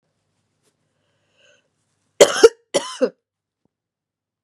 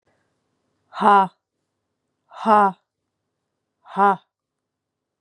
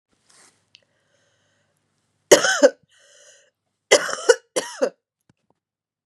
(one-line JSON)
{"cough_length": "4.4 s", "cough_amplitude": 32768, "cough_signal_mean_std_ratio": 0.19, "exhalation_length": "5.2 s", "exhalation_amplitude": 26544, "exhalation_signal_mean_std_ratio": 0.28, "three_cough_length": "6.1 s", "three_cough_amplitude": 32768, "three_cough_signal_mean_std_ratio": 0.24, "survey_phase": "beta (2021-08-13 to 2022-03-07)", "age": "18-44", "gender": "Female", "wearing_mask": "No", "symptom_cough_any": true, "symptom_runny_or_blocked_nose": true, "symptom_fever_high_temperature": true, "symptom_change_to_sense_of_smell_or_taste": true, "symptom_onset": "3 days", "smoker_status": "Ex-smoker", "respiratory_condition_asthma": false, "respiratory_condition_other": false, "recruitment_source": "Test and Trace", "submission_delay": "1 day", "covid_test_result": "Positive", "covid_test_method": "RT-qPCR", "covid_ct_value": 30.3, "covid_ct_gene": "ORF1ab gene"}